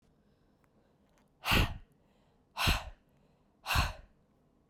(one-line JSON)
{"exhalation_length": "4.7 s", "exhalation_amplitude": 6290, "exhalation_signal_mean_std_ratio": 0.34, "survey_phase": "beta (2021-08-13 to 2022-03-07)", "age": "18-44", "gender": "Female", "wearing_mask": "No", "symptom_cough_any": true, "symptom_runny_or_blocked_nose": true, "symptom_sore_throat": true, "symptom_fatigue": true, "symptom_headache": true, "symptom_other": true, "symptom_onset": "4 days", "smoker_status": "Never smoked", "respiratory_condition_asthma": false, "respiratory_condition_other": false, "recruitment_source": "Test and Trace", "submission_delay": "1 day", "covid_test_result": "Positive", "covid_test_method": "RT-qPCR", "covid_ct_value": 21.4, "covid_ct_gene": "ORF1ab gene", "covid_ct_mean": 22.2, "covid_viral_load": "53000 copies/ml", "covid_viral_load_category": "Low viral load (10K-1M copies/ml)"}